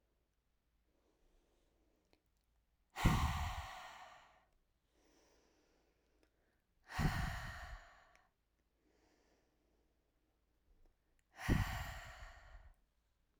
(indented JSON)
{
  "exhalation_length": "13.4 s",
  "exhalation_amplitude": 4071,
  "exhalation_signal_mean_std_ratio": 0.31,
  "survey_phase": "alpha (2021-03-01 to 2021-08-12)",
  "age": "18-44",
  "gender": "Female",
  "wearing_mask": "No",
  "symptom_cough_any": true,
  "symptom_shortness_of_breath": true,
  "symptom_fatigue": true,
  "symptom_fever_high_temperature": true,
  "symptom_headache": true,
  "smoker_status": "Never smoked",
  "respiratory_condition_asthma": false,
  "respiratory_condition_other": false,
  "recruitment_source": "Test and Trace",
  "submission_delay": "2 days",
  "covid_test_result": "Positive",
  "covid_test_method": "LFT"
}